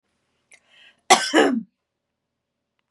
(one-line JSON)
{"cough_length": "2.9 s", "cough_amplitude": 32764, "cough_signal_mean_std_ratio": 0.29, "survey_phase": "beta (2021-08-13 to 2022-03-07)", "age": "18-44", "gender": "Female", "wearing_mask": "No", "symptom_sore_throat": true, "symptom_onset": "12 days", "smoker_status": "Current smoker (e-cigarettes or vapes only)", "respiratory_condition_asthma": false, "respiratory_condition_other": false, "recruitment_source": "REACT", "submission_delay": "1 day", "covid_test_result": "Negative", "covid_test_method": "RT-qPCR", "influenza_a_test_result": "Negative", "influenza_b_test_result": "Negative"}